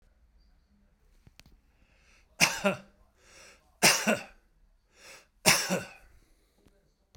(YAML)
three_cough_length: 7.2 s
three_cough_amplitude: 18291
three_cough_signal_mean_std_ratio: 0.29
survey_phase: beta (2021-08-13 to 2022-03-07)
age: 65+
gender: Male
wearing_mask: 'No'
symptom_none: true
smoker_status: Ex-smoker
respiratory_condition_asthma: false
respiratory_condition_other: false
recruitment_source: Test and Trace
submission_delay: 2 days
covid_test_result: Positive
covid_test_method: RT-qPCR
covid_ct_value: 26.1
covid_ct_gene: ORF1ab gene
covid_ct_mean: 26.8
covid_viral_load: 1600 copies/ml
covid_viral_load_category: Minimal viral load (< 10K copies/ml)